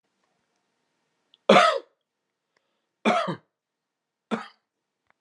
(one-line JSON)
{"three_cough_length": "5.2 s", "three_cough_amplitude": 24488, "three_cough_signal_mean_std_ratio": 0.25, "survey_phase": "beta (2021-08-13 to 2022-03-07)", "age": "45-64", "gender": "Male", "wearing_mask": "No", "symptom_none": true, "smoker_status": "Ex-smoker", "respiratory_condition_asthma": false, "respiratory_condition_other": false, "recruitment_source": "REACT", "submission_delay": "1 day", "covid_test_result": "Negative", "covid_test_method": "RT-qPCR"}